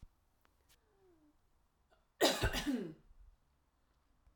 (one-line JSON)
{"cough_length": "4.4 s", "cough_amplitude": 4207, "cough_signal_mean_std_ratio": 0.31, "survey_phase": "alpha (2021-03-01 to 2021-08-12)", "age": "45-64", "gender": "Female", "wearing_mask": "No", "symptom_none": true, "smoker_status": "Ex-smoker", "respiratory_condition_asthma": false, "respiratory_condition_other": false, "recruitment_source": "REACT", "submission_delay": "1 day", "covid_test_result": "Negative", "covid_test_method": "RT-qPCR"}